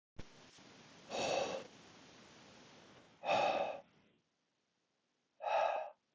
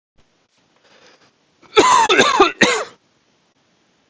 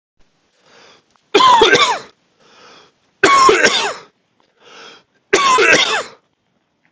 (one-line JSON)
{"exhalation_length": "6.1 s", "exhalation_amplitude": 2314, "exhalation_signal_mean_std_ratio": 0.45, "cough_length": "4.1 s", "cough_amplitude": 32768, "cough_signal_mean_std_ratio": 0.39, "three_cough_length": "6.9 s", "three_cough_amplitude": 32768, "three_cough_signal_mean_std_ratio": 0.47, "survey_phase": "alpha (2021-03-01 to 2021-08-12)", "age": "18-44", "gender": "Male", "wearing_mask": "No", "symptom_headache": true, "smoker_status": "Never smoked", "respiratory_condition_asthma": false, "respiratory_condition_other": false, "recruitment_source": "REACT", "submission_delay": "1 day", "covid_test_result": "Negative", "covid_test_method": "RT-qPCR"}